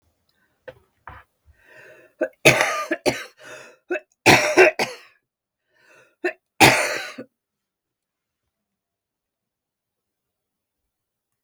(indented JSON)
{
  "three_cough_length": "11.4 s",
  "three_cough_amplitude": 32768,
  "three_cough_signal_mean_std_ratio": 0.27,
  "survey_phase": "beta (2021-08-13 to 2022-03-07)",
  "age": "65+",
  "gender": "Female",
  "wearing_mask": "No",
  "symptom_cough_any": true,
  "symptom_runny_or_blocked_nose": true,
  "symptom_shortness_of_breath": true,
  "smoker_status": "Ex-smoker",
  "respiratory_condition_asthma": false,
  "respiratory_condition_other": true,
  "recruitment_source": "REACT",
  "submission_delay": "2 days",
  "covid_test_result": "Negative",
  "covid_test_method": "RT-qPCR",
  "influenza_a_test_result": "Negative",
  "influenza_b_test_result": "Negative"
}